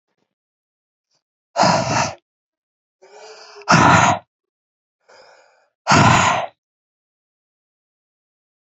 {"exhalation_length": "8.7 s", "exhalation_amplitude": 29809, "exhalation_signal_mean_std_ratio": 0.34, "survey_phase": "beta (2021-08-13 to 2022-03-07)", "age": "45-64", "gender": "Male", "wearing_mask": "Yes", "symptom_cough_any": true, "symptom_runny_or_blocked_nose": true, "symptom_fever_high_temperature": true, "symptom_headache": true, "symptom_change_to_sense_of_smell_or_taste": true, "symptom_onset": "3 days", "smoker_status": "Never smoked", "respiratory_condition_asthma": false, "respiratory_condition_other": false, "recruitment_source": "Test and Trace", "submission_delay": "2 days", "covid_test_result": "Positive", "covid_test_method": "RT-qPCR"}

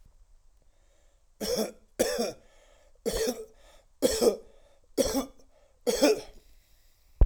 {"cough_length": "7.3 s", "cough_amplitude": 12321, "cough_signal_mean_std_ratio": 0.39, "survey_phase": "alpha (2021-03-01 to 2021-08-12)", "age": "45-64", "gender": "Male", "wearing_mask": "No", "symptom_cough_any": true, "symptom_abdominal_pain": true, "symptom_fatigue": true, "symptom_headache": true, "symptom_change_to_sense_of_smell_or_taste": true, "symptom_onset": "8 days", "smoker_status": "Never smoked", "respiratory_condition_asthma": false, "respiratory_condition_other": false, "recruitment_source": "Test and Trace", "submission_delay": "2 days", "covid_test_result": "Positive", "covid_test_method": "RT-qPCR", "covid_ct_value": 13.6, "covid_ct_gene": "ORF1ab gene", "covid_ct_mean": 14.1, "covid_viral_load": "24000000 copies/ml", "covid_viral_load_category": "High viral load (>1M copies/ml)"}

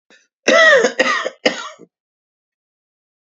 {"cough_length": "3.3 s", "cough_amplitude": 30635, "cough_signal_mean_std_ratio": 0.4, "survey_phase": "beta (2021-08-13 to 2022-03-07)", "age": "45-64", "gender": "Male", "wearing_mask": "No", "symptom_headache": true, "symptom_onset": "10 days", "smoker_status": "Never smoked", "respiratory_condition_asthma": true, "respiratory_condition_other": false, "recruitment_source": "REACT", "submission_delay": "0 days", "covid_test_result": "Negative", "covid_test_method": "RT-qPCR", "influenza_a_test_result": "Negative", "influenza_b_test_result": "Negative"}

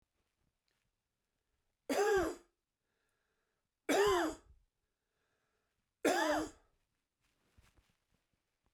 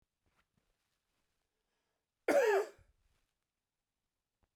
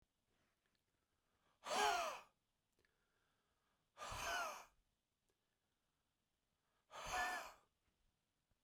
{"three_cough_length": "8.7 s", "three_cough_amplitude": 3814, "three_cough_signal_mean_std_ratio": 0.33, "cough_length": "4.6 s", "cough_amplitude": 3437, "cough_signal_mean_std_ratio": 0.24, "exhalation_length": "8.6 s", "exhalation_amplitude": 1719, "exhalation_signal_mean_std_ratio": 0.34, "survey_phase": "beta (2021-08-13 to 2022-03-07)", "age": "45-64", "gender": "Male", "wearing_mask": "No", "symptom_none": true, "smoker_status": "Never smoked", "respiratory_condition_asthma": false, "respiratory_condition_other": false, "recruitment_source": "REACT", "submission_delay": "2 days", "covid_test_result": "Negative", "covid_test_method": "RT-qPCR", "influenza_a_test_result": "Negative", "influenza_b_test_result": "Negative"}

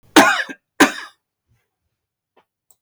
{"cough_length": "2.8 s", "cough_amplitude": 32768, "cough_signal_mean_std_ratio": 0.28, "survey_phase": "beta (2021-08-13 to 2022-03-07)", "age": "45-64", "gender": "Male", "wearing_mask": "No", "symptom_none": true, "smoker_status": "Never smoked", "respiratory_condition_asthma": true, "respiratory_condition_other": false, "recruitment_source": "REACT", "submission_delay": "2 days", "covid_test_result": "Negative", "covid_test_method": "RT-qPCR", "influenza_a_test_result": "Negative", "influenza_b_test_result": "Negative"}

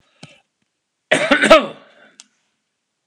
{"cough_length": "3.1 s", "cough_amplitude": 32768, "cough_signal_mean_std_ratio": 0.29, "survey_phase": "alpha (2021-03-01 to 2021-08-12)", "age": "65+", "gender": "Male", "wearing_mask": "No", "symptom_none": true, "smoker_status": "Ex-smoker", "respiratory_condition_asthma": false, "respiratory_condition_other": false, "recruitment_source": "REACT", "submission_delay": "8 days", "covid_test_result": "Negative", "covid_test_method": "RT-qPCR"}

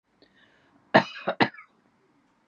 {"cough_length": "2.5 s", "cough_amplitude": 21040, "cough_signal_mean_std_ratio": 0.23, "survey_phase": "beta (2021-08-13 to 2022-03-07)", "age": "65+", "gender": "Female", "wearing_mask": "No", "symptom_cough_any": true, "symptom_shortness_of_breath": true, "symptom_sore_throat": true, "symptom_change_to_sense_of_smell_or_taste": true, "symptom_onset": "9 days", "smoker_status": "Never smoked", "respiratory_condition_asthma": false, "respiratory_condition_other": false, "recruitment_source": "Test and Trace", "submission_delay": "1 day", "covid_test_result": "Negative", "covid_test_method": "RT-qPCR"}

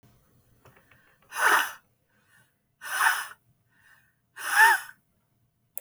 {"exhalation_length": "5.8 s", "exhalation_amplitude": 15581, "exhalation_signal_mean_std_ratio": 0.33, "survey_phase": "beta (2021-08-13 to 2022-03-07)", "age": "18-44", "gender": "Female", "wearing_mask": "No", "symptom_none": true, "smoker_status": "Ex-smoker", "respiratory_condition_asthma": false, "respiratory_condition_other": false, "recruitment_source": "REACT", "submission_delay": "1 day", "covid_test_result": "Negative", "covid_test_method": "RT-qPCR"}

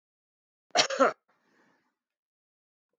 {"cough_length": "3.0 s", "cough_amplitude": 16811, "cough_signal_mean_std_ratio": 0.24, "survey_phase": "beta (2021-08-13 to 2022-03-07)", "age": "45-64", "gender": "Male", "wearing_mask": "No", "symptom_none": true, "smoker_status": "Ex-smoker", "respiratory_condition_asthma": false, "respiratory_condition_other": false, "recruitment_source": "REACT", "submission_delay": "1 day", "covid_test_result": "Negative", "covid_test_method": "RT-qPCR"}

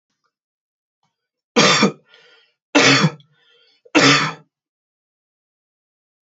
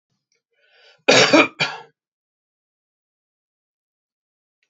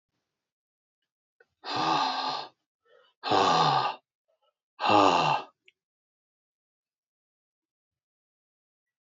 {"three_cough_length": "6.2 s", "three_cough_amplitude": 32768, "three_cough_signal_mean_std_ratio": 0.33, "cough_length": "4.7 s", "cough_amplitude": 29332, "cough_signal_mean_std_ratio": 0.25, "exhalation_length": "9.0 s", "exhalation_amplitude": 16430, "exhalation_signal_mean_std_ratio": 0.37, "survey_phase": "beta (2021-08-13 to 2022-03-07)", "age": "45-64", "gender": "Male", "wearing_mask": "No", "symptom_cough_any": true, "symptom_runny_or_blocked_nose": true, "symptom_onset": "3 days", "smoker_status": "Never smoked", "respiratory_condition_asthma": false, "respiratory_condition_other": false, "recruitment_source": "Test and Trace", "submission_delay": "2 days", "covid_test_result": "Positive", "covid_test_method": "RT-qPCR"}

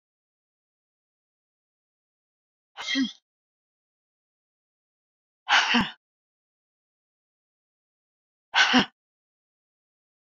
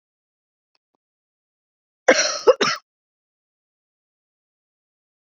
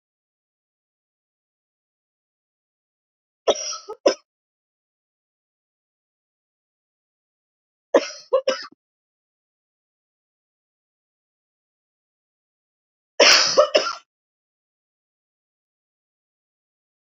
{"exhalation_length": "10.3 s", "exhalation_amplitude": 17796, "exhalation_signal_mean_std_ratio": 0.23, "cough_length": "5.4 s", "cough_amplitude": 31841, "cough_signal_mean_std_ratio": 0.21, "three_cough_length": "17.1 s", "three_cough_amplitude": 30480, "three_cough_signal_mean_std_ratio": 0.19, "survey_phase": "beta (2021-08-13 to 2022-03-07)", "age": "45-64", "gender": "Female", "wearing_mask": "No", "symptom_cough_any": true, "smoker_status": "Never smoked", "respiratory_condition_asthma": false, "respiratory_condition_other": false, "recruitment_source": "REACT", "submission_delay": "1 day", "covid_test_result": "Negative", "covid_test_method": "RT-qPCR"}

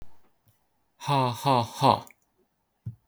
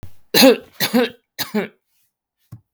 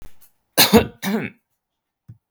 {"exhalation_length": "3.1 s", "exhalation_amplitude": 17866, "exhalation_signal_mean_std_ratio": 0.41, "three_cough_length": "2.7 s", "three_cough_amplitude": 32766, "three_cough_signal_mean_std_ratio": 0.37, "cough_length": "2.3 s", "cough_amplitude": 32768, "cough_signal_mean_std_ratio": 0.33, "survey_phase": "beta (2021-08-13 to 2022-03-07)", "age": "45-64", "gender": "Male", "wearing_mask": "No", "symptom_none": true, "smoker_status": "Never smoked", "respiratory_condition_asthma": false, "respiratory_condition_other": false, "recruitment_source": "REACT", "submission_delay": "2 days", "covid_test_result": "Negative", "covid_test_method": "RT-qPCR", "influenza_a_test_result": "Negative", "influenza_b_test_result": "Negative"}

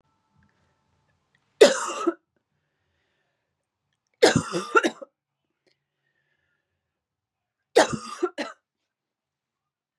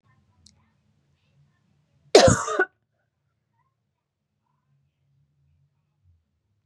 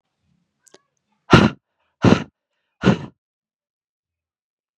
{"three_cough_length": "10.0 s", "three_cough_amplitude": 29700, "three_cough_signal_mean_std_ratio": 0.23, "cough_length": "6.7 s", "cough_amplitude": 32734, "cough_signal_mean_std_ratio": 0.18, "exhalation_length": "4.8 s", "exhalation_amplitude": 32768, "exhalation_signal_mean_std_ratio": 0.24, "survey_phase": "beta (2021-08-13 to 2022-03-07)", "age": "18-44", "gender": "Female", "wearing_mask": "No", "symptom_cough_any": true, "symptom_runny_or_blocked_nose": true, "symptom_sore_throat": true, "symptom_fatigue": true, "smoker_status": "Never smoked", "respiratory_condition_asthma": false, "respiratory_condition_other": false, "recruitment_source": "Test and Trace", "submission_delay": "0 days", "covid_test_result": "Positive", "covid_test_method": "LFT"}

